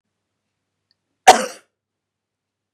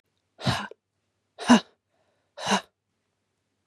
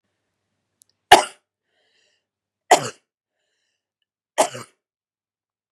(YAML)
cough_length: 2.7 s
cough_amplitude: 32768
cough_signal_mean_std_ratio: 0.16
exhalation_length: 3.7 s
exhalation_amplitude: 20520
exhalation_signal_mean_std_ratio: 0.25
three_cough_length: 5.7 s
three_cough_amplitude: 32768
three_cough_signal_mean_std_ratio: 0.17
survey_phase: beta (2021-08-13 to 2022-03-07)
age: 18-44
gender: Female
wearing_mask: 'No'
symptom_runny_or_blocked_nose: true
symptom_sore_throat: true
symptom_headache: true
smoker_status: Ex-smoker
respiratory_condition_asthma: false
respiratory_condition_other: false
recruitment_source: REACT
submission_delay: 2 days
covid_test_result: Negative
covid_test_method: RT-qPCR
influenza_a_test_result: Negative
influenza_b_test_result: Negative